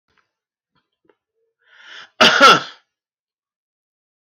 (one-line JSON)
{"cough_length": "4.3 s", "cough_amplitude": 30282, "cough_signal_mean_std_ratio": 0.25, "survey_phase": "beta (2021-08-13 to 2022-03-07)", "age": "65+", "gender": "Male", "wearing_mask": "No", "symptom_none": true, "smoker_status": "Never smoked", "respiratory_condition_asthma": false, "respiratory_condition_other": false, "recruitment_source": "REACT", "submission_delay": "3 days", "covid_test_result": "Negative", "covid_test_method": "RT-qPCR"}